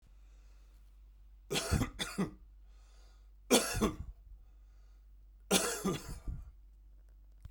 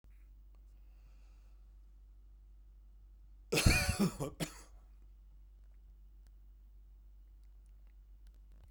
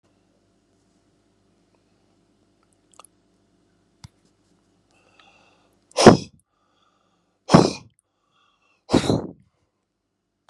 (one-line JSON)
{"three_cough_length": "7.5 s", "three_cough_amplitude": 8508, "three_cough_signal_mean_std_ratio": 0.44, "cough_length": "8.7 s", "cough_amplitude": 8483, "cough_signal_mean_std_ratio": 0.35, "exhalation_length": "10.5 s", "exhalation_amplitude": 32768, "exhalation_signal_mean_std_ratio": 0.17, "survey_phase": "beta (2021-08-13 to 2022-03-07)", "age": "65+", "gender": "Male", "wearing_mask": "No", "symptom_none": true, "smoker_status": "Ex-smoker", "respiratory_condition_asthma": false, "respiratory_condition_other": false, "recruitment_source": "REACT", "submission_delay": "4 days", "covid_test_result": "Negative", "covid_test_method": "RT-qPCR", "influenza_a_test_result": "Negative", "influenza_b_test_result": "Negative"}